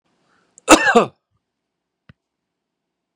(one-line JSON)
{"cough_length": "3.2 s", "cough_amplitude": 32768, "cough_signal_mean_std_ratio": 0.24, "survey_phase": "beta (2021-08-13 to 2022-03-07)", "age": "45-64", "gender": "Male", "wearing_mask": "No", "symptom_none": true, "symptom_onset": "13 days", "smoker_status": "Ex-smoker", "respiratory_condition_asthma": false, "respiratory_condition_other": false, "recruitment_source": "REACT", "submission_delay": "3 days", "covid_test_result": "Negative", "covid_test_method": "RT-qPCR", "influenza_a_test_result": "Unknown/Void", "influenza_b_test_result": "Unknown/Void"}